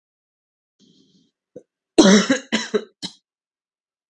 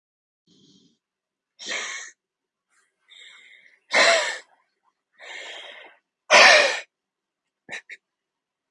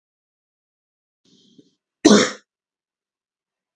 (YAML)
three_cough_length: 4.1 s
three_cough_amplitude: 32768
three_cough_signal_mean_std_ratio: 0.28
exhalation_length: 8.7 s
exhalation_amplitude: 32768
exhalation_signal_mean_std_ratio: 0.27
cough_length: 3.8 s
cough_amplitude: 32768
cough_signal_mean_std_ratio: 0.19
survey_phase: beta (2021-08-13 to 2022-03-07)
age: 18-44
gender: Male
wearing_mask: 'No'
symptom_runny_or_blocked_nose: true
symptom_change_to_sense_of_smell_or_taste: true
symptom_loss_of_taste: true
symptom_onset: 8 days
smoker_status: Never smoked
respiratory_condition_asthma: true
respiratory_condition_other: false
recruitment_source: REACT
submission_delay: 1 day
covid_test_result: Positive
covid_test_method: RT-qPCR
covid_ct_value: 18.7
covid_ct_gene: E gene
influenza_a_test_result: Negative
influenza_b_test_result: Negative